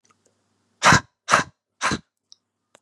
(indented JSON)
{
  "exhalation_length": "2.8 s",
  "exhalation_amplitude": 31895,
  "exhalation_signal_mean_std_ratio": 0.29,
  "survey_phase": "beta (2021-08-13 to 2022-03-07)",
  "age": "18-44",
  "gender": "Male",
  "wearing_mask": "No",
  "symptom_cough_any": true,
  "symptom_runny_or_blocked_nose": true,
  "symptom_diarrhoea": true,
  "symptom_fatigue": true,
  "symptom_headache": true,
  "smoker_status": "Never smoked",
  "respiratory_condition_asthma": false,
  "respiratory_condition_other": false,
  "recruitment_source": "Test and Trace",
  "submission_delay": "2 days",
  "covid_test_result": "Positive",
  "covid_test_method": "RT-qPCR"
}